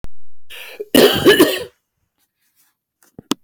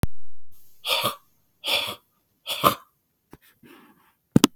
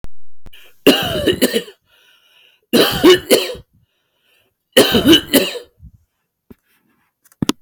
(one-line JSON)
{"cough_length": "3.4 s", "cough_amplitude": 32767, "cough_signal_mean_std_ratio": 0.46, "exhalation_length": "4.6 s", "exhalation_amplitude": 32768, "exhalation_signal_mean_std_ratio": 0.44, "three_cough_length": "7.6 s", "three_cough_amplitude": 32768, "three_cough_signal_mean_std_ratio": 0.44, "survey_phase": "beta (2021-08-13 to 2022-03-07)", "age": "45-64", "gender": "Male", "wearing_mask": "No", "symptom_none": true, "symptom_onset": "13 days", "smoker_status": "Never smoked", "respiratory_condition_asthma": true, "respiratory_condition_other": false, "recruitment_source": "REACT", "submission_delay": "0 days", "covid_test_result": "Negative", "covid_test_method": "RT-qPCR", "influenza_a_test_result": "Negative", "influenza_b_test_result": "Negative"}